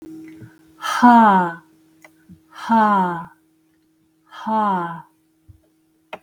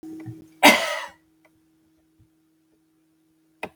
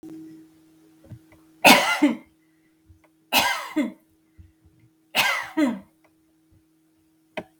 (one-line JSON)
{"exhalation_length": "6.2 s", "exhalation_amplitude": 32768, "exhalation_signal_mean_std_ratio": 0.43, "cough_length": "3.8 s", "cough_amplitude": 32768, "cough_signal_mean_std_ratio": 0.24, "three_cough_length": "7.6 s", "three_cough_amplitude": 32768, "three_cough_signal_mean_std_ratio": 0.33, "survey_phase": "beta (2021-08-13 to 2022-03-07)", "age": "45-64", "gender": "Female", "wearing_mask": "No", "symptom_none": true, "smoker_status": "Ex-smoker", "respiratory_condition_asthma": false, "respiratory_condition_other": false, "recruitment_source": "REACT", "submission_delay": "2 days", "covid_test_result": "Negative", "covid_test_method": "RT-qPCR", "influenza_a_test_result": "Negative", "influenza_b_test_result": "Negative"}